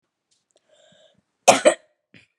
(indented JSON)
{
  "cough_length": "2.4 s",
  "cough_amplitude": 32768,
  "cough_signal_mean_std_ratio": 0.21,
  "survey_phase": "beta (2021-08-13 to 2022-03-07)",
  "age": "18-44",
  "gender": "Female",
  "wearing_mask": "No",
  "symptom_cough_any": true,
  "symptom_runny_or_blocked_nose": true,
  "symptom_fatigue": true,
  "symptom_headache": true,
  "symptom_onset": "4 days",
  "smoker_status": "Ex-smoker",
  "respiratory_condition_asthma": false,
  "respiratory_condition_other": false,
  "recruitment_source": "Test and Trace",
  "submission_delay": "2 days",
  "covid_test_result": "Negative",
  "covid_test_method": "ePCR"
}